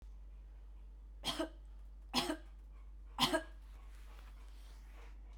{
  "three_cough_length": "5.4 s",
  "three_cough_amplitude": 4310,
  "three_cough_signal_mean_std_ratio": 0.62,
  "survey_phase": "beta (2021-08-13 to 2022-03-07)",
  "age": "45-64",
  "gender": "Female",
  "wearing_mask": "No",
  "symptom_cough_any": true,
  "symptom_runny_or_blocked_nose": true,
  "symptom_fatigue": true,
  "symptom_fever_high_temperature": true,
  "symptom_headache": true,
  "symptom_change_to_sense_of_smell_or_taste": true,
  "symptom_other": true,
  "symptom_onset": "2 days",
  "smoker_status": "Ex-smoker",
  "respiratory_condition_asthma": false,
  "respiratory_condition_other": false,
  "recruitment_source": "Test and Trace",
  "submission_delay": "1 day",
  "covid_test_result": "Positive",
  "covid_test_method": "RT-qPCR",
  "covid_ct_value": 12.0,
  "covid_ct_gene": "ORF1ab gene",
  "covid_ct_mean": 12.5,
  "covid_viral_load": "82000000 copies/ml",
  "covid_viral_load_category": "High viral load (>1M copies/ml)"
}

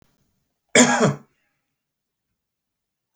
{
  "cough_length": "3.2 s",
  "cough_amplitude": 29304,
  "cough_signal_mean_std_ratio": 0.27,
  "survey_phase": "beta (2021-08-13 to 2022-03-07)",
  "age": "65+",
  "gender": "Male",
  "wearing_mask": "No",
  "symptom_none": true,
  "smoker_status": "Ex-smoker",
  "respiratory_condition_asthma": false,
  "respiratory_condition_other": false,
  "recruitment_source": "REACT",
  "submission_delay": "2 days",
  "covid_test_result": "Negative",
  "covid_test_method": "RT-qPCR"
}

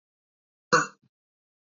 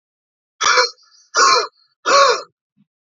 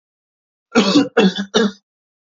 {
  "cough_length": "1.8 s",
  "cough_amplitude": 16129,
  "cough_signal_mean_std_ratio": 0.2,
  "exhalation_length": "3.2 s",
  "exhalation_amplitude": 29933,
  "exhalation_signal_mean_std_ratio": 0.45,
  "three_cough_length": "2.2 s",
  "three_cough_amplitude": 28502,
  "three_cough_signal_mean_std_ratio": 0.47,
  "survey_phase": "beta (2021-08-13 to 2022-03-07)",
  "age": "18-44",
  "gender": "Male",
  "wearing_mask": "No",
  "symptom_none": true,
  "smoker_status": "Never smoked",
  "respiratory_condition_asthma": false,
  "respiratory_condition_other": true,
  "recruitment_source": "REACT",
  "submission_delay": "1 day",
  "covid_test_result": "Negative",
  "covid_test_method": "RT-qPCR"
}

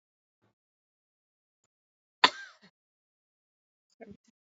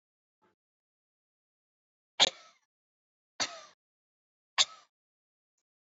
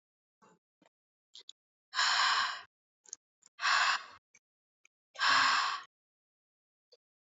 {
  "cough_length": "4.5 s",
  "cough_amplitude": 26361,
  "cough_signal_mean_std_ratio": 0.09,
  "three_cough_length": "5.8 s",
  "three_cough_amplitude": 13326,
  "three_cough_signal_mean_std_ratio": 0.15,
  "exhalation_length": "7.3 s",
  "exhalation_amplitude": 6315,
  "exhalation_signal_mean_std_ratio": 0.39,
  "survey_phase": "alpha (2021-03-01 to 2021-08-12)",
  "age": "18-44",
  "gender": "Female",
  "wearing_mask": "No",
  "symptom_none": true,
  "symptom_onset": "6 days",
  "smoker_status": "Never smoked",
  "respiratory_condition_asthma": false,
  "respiratory_condition_other": false,
  "recruitment_source": "REACT",
  "submission_delay": "1 day",
  "covid_test_result": "Negative",
  "covid_test_method": "RT-qPCR"
}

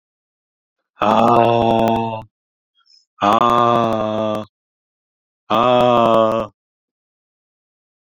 {
  "exhalation_length": "8.0 s",
  "exhalation_amplitude": 31997,
  "exhalation_signal_mean_std_ratio": 0.5,
  "survey_phase": "beta (2021-08-13 to 2022-03-07)",
  "age": "45-64",
  "gender": "Male",
  "wearing_mask": "No",
  "symptom_headache": true,
  "smoker_status": "Never smoked",
  "respiratory_condition_asthma": false,
  "respiratory_condition_other": false,
  "recruitment_source": "REACT",
  "submission_delay": "2 days",
  "covid_test_result": "Negative",
  "covid_test_method": "RT-qPCR"
}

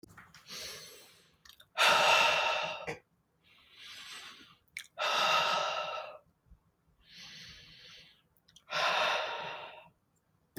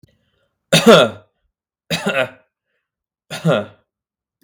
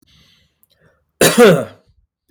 {
  "exhalation_length": "10.6 s",
  "exhalation_amplitude": 7514,
  "exhalation_signal_mean_std_ratio": 0.47,
  "three_cough_length": "4.4 s",
  "three_cough_amplitude": 32768,
  "three_cough_signal_mean_std_ratio": 0.33,
  "cough_length": "2.3 s",
  "cough_amplitude": 32768,
  "cough_signal_mean_std_ratio": 0.35,
  "survey_phase": "beta (2021-08-13 to 2022-03-07)",
  "age": "18-44",
  "gender": "Male",
  "wearing_mask": "No",
  "symptom_none": true,
  "smoker_status": "Never smoked",
  "respiratory_condition_asthma": false,
  "respiratory_condition_other": false,
  "recruitment_source": "REACT",
  "submission_delay": "1 day",
  "covid_test_result": "Negative",
  "covid_test_method": "RT-qPCR",
  "influenza_a_test_result": "Negative",
  "influenza_b_test_result": "Negative"
}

